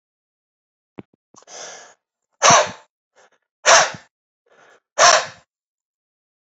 {"exhalation_length": "6.5 s", "exhalation_amplitude": 32335, "exhalation_signal_mean_std_ratio": 0.27, "survey_phase": "beta (2021-08-13 to 2022-03-07)", "age": "45-64", "gender": "Male", "wearing_mask": "No", "symptom_none": true, "smoker_status": "Ex-smoker", "respiratory_condition_asthma": false, "respiratory_condition_other": false, "recruitment_source": "REACT", "submission_delay": "2 days", "covid_test_result": "Negative", "covid_test_method": "RT-qPCR", "influenza_a_test_result": "Negative", "influenza_b_test_result": "Negative"}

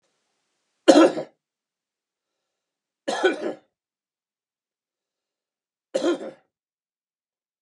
{"three_cough_length": "7.6 s", "three_cough_amplitude": 30879, "three_cough_signal_mean_std_ratio": 0.23, "survey_phase": "beta (2021-08-13 to 2022-03-07)", "age": "65+", "gender": "Male", "wearing_mask": "No", "symptom_none": true, "smoker_status": "Never smoked", "respiratory_condition_asthma": false, "respiratory_condition_other": false, "recruitment_source": "REACT", "submission_delay": "5 days", "covid_test_result": "Negative", "covid_test_method": "RT-qPCR", "influenza_a_test_result": "Negative", "influenza_b_test_result": "Negative"}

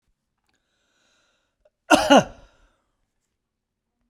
{"cough_length": "4.1 s", "cough_amplitude": 30620, "cough_signal_mean_std_ratio": 0.21, "survey_phase": "beta (2021-08-13 to 2022-03-07)", "age": "45-64", "gender": "Male", "wearing_mask": "No", "symptom_none": true, "smoker_status": "Never smoked", "respiratory_condition_asthma": false, "respiratory_condition_other": false, "recruitment_source": "REACT", "submission_delay": "1 day", "covid_test_result": "Negative", "covid_test_method": "RT-qPCR"}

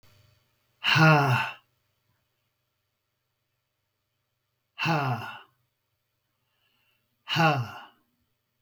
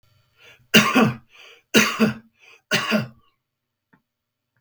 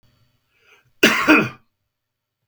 {"exhalation_length": "8.6 s", "exhalation_amplitude": 12864, "exhalation_signal_mean_std_ratio": 0.33, "three_cough_length": "4.6 s", "three_cough_amplitude": 32768, "three_cough_signal_mean_std_ratio": 0.36, "cough_length": "2.5 s", "cough_amplitude": 32768, "cough_signal_mean_std_ratio": 0.32, "survey_phase": "beta (2021-08-13 to 2022-03-07)", "age": "45-64", "gender": "Male", "wearing_mask": "Yes", "symptom_cough_any": true, "symptom_diarrhoea": true, "symptom_fatigue": true, "symptom_change_to_sense_of_smell_or_taste": true, "symptom_loss_of_taste": true, "smoker_status": "Ex-smoker", "respiratory_condition_asthma": false, "respiratory_condition_other": false, "recruitment_source": "Test and Trace", "submission_delay": "2 days", "covid_test_result": "Positive", "covid_test_method": "RT-qPCR", "covid_ct_value": 25.1, "covid_ct_gene": "ORF1ab gene", "covid_ct_mean": 25.5, "covid_viral_load": "4500 copies/ml", "covid_viral_load_category": "Minimal viral load (< 10K copies/ml)"}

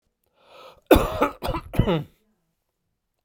{"cough_length": "3.2 s", "cough_amplitude": 32767, "cough_signal_mean_std_ratio": 0.34, "survey_phase": "alpha (2021-03-01 to 2021-08-12)", "age": "65+", "gender": "Male", "wearing_mask": "No", "symptom_cough_any": true, "symptom_fatigue": true, "symptom_onset": "4 days", "smoker_status": "Ex-smoker", "respiratory_condition_asthma": false, "respiratory_condition_other": false, "recruitment_source": "Test and Trace", "submission_delay": "2 days", "covid_test_result": "Positive", "covid_test_method": "RT-qPCR", "covid_ct_value": 19.0, "covid_ct_gene": "ORF1ab gene"}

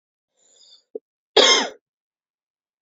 {"cough_length": "2.8 s", "cough_amplitude": 31037, "cough_signal_mean_std_ratio": 0.26, "survey_phase": "beta (2021-08-13 to 2022-03-07)", "age": "18-44", "gender": "Female", "wearing_mask": "No", "symptom_runny_or_blocked_nose": true, "symptom_sore_throat": true, "symptom_fatigue": true, "symptom_headache": true, "symptom_onset": "3 days", "smoker_status": "Never smoked", "respiratory_condition_asthma": false, "respiratory_condition_other": false, "recruitment_source": "Test and Trace", "submission_delay": "1 day", "covid_test_result": "Positive", "covid_test_method": "RT-qPCR", "covid_ct_value": 22.7, "covid_ct_gene": "N gene"}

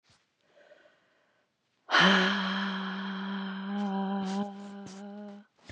{"exhalation_length": "5.7 s", "exhalation_amplitude": 11405, "exhalation_signal_mean_std_ratio": 0.56, "survey_phase": "beta (2021-08-13 to 2022-03-07)", "age": "45-64", "gender": "Female", "wearing_mask": "No", "symptom_none": true, "smoker_status": "Ex-smoker", "respiratory_condition_asthma": false, "respiratory_condition_other": false, "recruitment_source": "REACT", "submission_delay": "2 days", "covid_test_result": "Negative", "covid_test_method": "RT-qPCR", "influenza_a_test_result": "Negative", "influenza_b_test_result": "Negative"}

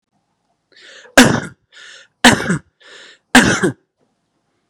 {"three_cough_length": "4.7 s", "three_cough_amplitude": 32768, "three_cough_signal_mean_std_ratio": 0.32, "survey_phase": "beta (2021-08-13 to 2022-03-07)", "age": "18-44", "gender": "Male", "wearing_mask": "No", "symptom_none": true, "smoker_status": "Never smoked", "respiratory_condition_asthma": false, "respiratory_condition_other": false, "recruitment_source": "Test and Trace", "submission_delay": "-1 day", "covid_test_result": "Negative", "covid_test_method": "LFT"}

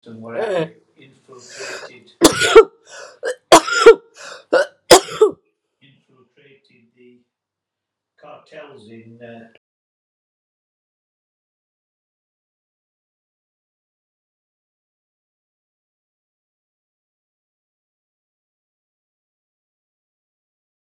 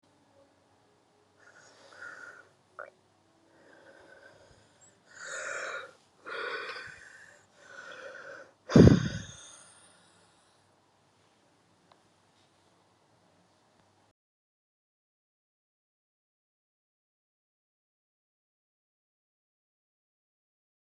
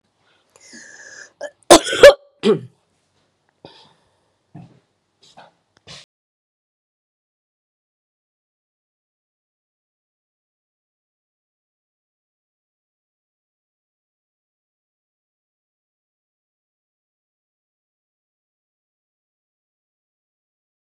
{"three_cough_length": "20.8 s", "three_cough_amplitude": 32768, "three_cough_signal_mean_std_ratio": 0.19, "exhalation_length": "20.9 s", "exhalation_amplitude": 21786, "exhalation_signal_mean_std_ratio": 0.16, "cough_length": "20.8 s", "cough_amplitude": 32768, "cough_signal_mean_std_ratio": 0.11, "survey_phase": "beta (2021-08-13 to 2022-03-07)", "age": "65+", "gender": "Female", "wearing_mask": "No", "symptom_none": true, "smoker_status": "Ex-smoker", "respiratory_condition_asthma": true, "respiratory_condition_other": false, "recruitment_source": "REACT", "submission_delay": "2 days", "covid_test_result": "Negative", "covid_test_method": "RT-qPCR"}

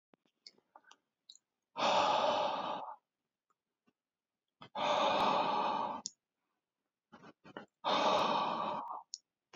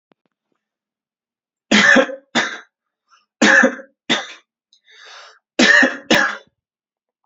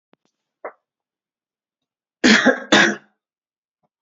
{"exhalation_length": "9.6 s", "exhalation_amplitude": 3898, "exhalation_signal_mean_std_ratio": 0.52, "three_cough_length": "7.3 s", "three_cough_amplitude": 30899, "three_cough_signal_mean_std_ratio": 0.38, "cough_length": "4.0 s", "cough_amplitude": 28804, "cough_signal_mean_std_ratio": 0.29, "survey_phase": "alpha (2021-03-01 to 2021-08-12)", "age": "18-44", "gender": "Male", "wearing_mask": "No", "symptom_none": true, "smoker_status": "Never smoked", "respiratory_condition_asthma": false, "respiratory_condition_other": false, "recruitment_source": "REACT", "submission_delay": "3 days", "covid_test_result": "Negative", "covid_test_method": "RT-qPCR"}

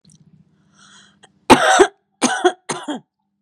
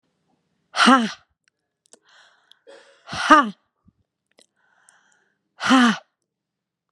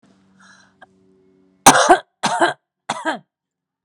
{"cough_length": "3.4 s", "cough_amplitude": 32768, "cough_signal_mean_std_ratio": 0.34, "exhalation_length": "6.9 s", "exhalation_amplitude": 32767, "exhalation_signal_mean_std_ratio": 0.28, "three_cough_length": "3.8 s", "three_cough_amplitude": 32768, "three_cough_signal_mean_std_ratio": 0.31, "survey_phase": "beta (2021-08-13 to 2022-03-07)", "age": "45-64", "gender": "Female", "wearing_mask": "No", "symptom_none": true, "smoker_status": "Ex-smoker", "respiratory_condition_asthma": true, "respiratory_condition_other": false, "recruitment_source": "Test and Trace", "submission_delay": "1 day", "covid_test_result": "Positive", "covid_test_method": "RT-qPCR", "covid_ct_value": 21.7, "covid_ct_gene": "ORF1ab gene", "covid_ct_mean": 22.1, "covid_viral_load": "55000 copies/ml", "covid_viral_load_category": "Low viral load (10K-1M copies/ml)"}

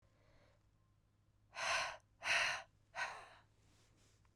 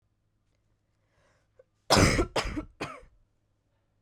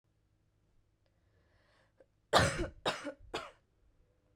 {"exhalation_length": "4.4 s", "exhalation_amplitude": 2145, "exhalation_signal_mean_std_ratio": 0.4, "cough_length": "4.0 s", "cough_amplitude": 14472, "cough_signal_mean_std_ratio": 0.3, "three_cough_length": "4.4 s", "three_cough_amplitude": 10703, "three_cough_signal_mean_std_ratio": 0.28, "survey_phase": "beta (2021-08-13 to 2022-03-07)", "age": "18-44", "gender": "Female", "wearing_mask": "No", "symptom_cough_any": true, "symptom_fatigue": true, "symptom_headache": true, "symptom_change_to_sense_of_smell_or_taste": true, "symptom_loss_of_taste": true, "smoker_status": "Never smoked", "respiratory_condition_asthma": false, "respiratory_condition_other": false, "recruitment_source": "Test and Trace", "submission_delay": "1 day", "covid_test_result": "Positive", "covid_test_method": "RT-qPCR", "covid_ct_value": 16.9, "covid_ct_gene": "N gene", "covid_ct_mean": 17.9, "covid_viral_load": "1300000 copies/ml", "covid_viral_load_category": "High viral load (>1M copies/ml)"}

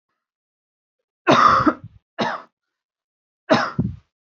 {"three_cough_length": "4.4 s", "three_cough_amplitude": 28047, "three_cough_signal_mean_std_ratio": 0.36, "survey_phase": "beta (2021-08-13 to 2022-03-07)", "age": "18-44", "gender": "Female", "wearing_mask": "No", "symptom_none": true, "smoker_status": "Never smoked", "respiratory_condition_asthma": false, "respiratory_condition_other": false, "recruitment_source": "REACT", "submission_delay": "1 day", "covid_test_result": "Negative", "covid_test_method": "RT-qPCR", "influenza_a_test_result": "Negative", "influenza_b_test_result": "Negative"}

